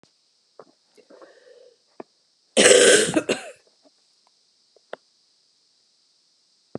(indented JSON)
{
  "cough_length": "6.8 s",
  "cough_amplitude": 32680,
  "cough_signal_mean_std_ratio": 0.26,
  "survey_phase": "beta (2021-08-13 to 2022-03-07)",
  "age": "18-44",
  "gender": "Female",
  "wearing_mask": "No",
  "symptom_cough_any": true,
  "symptom_runny_or_blocked_nose": true,
  "symptom_shortness_of_breath": true,
  "symptom_diarrhoea": true,
  "symptom_fatigue": true,
  "symptom_headache": true,
  "symptom_other": true,
  "smoker_status": "Never smoked",
  "respiratory_condition_asthma": false,
  "respiratory_condition_other": false,
  "recruitment_source": "Test and Trace",
  "submission_delay": "1 day",
  "covid_test_result": "Positive",
  "covid_test_method": "RT-qPCR"
}